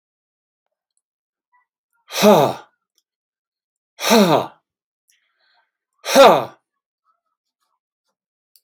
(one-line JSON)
{"exhalation_length": "8.6 s", "exhalation_amplitude": 30192, "exhalation_signal_mean_std_ratio": 0.27, "survey_phase": "alpha (2021-03-01 to 2021-08-12)", "age": "65+", "gender": "Male", "wearing_mask": "No", "symptom_none": true, "smoker_status": "Ex-smoker", "respiratory_condition_asthma": false, "respiratory_condition_other": false, "recruitment_source": "REACT", "submission_delay": "1 day", "covid_test_result": "Negative", "covid_test_method": "RT-qPCR"}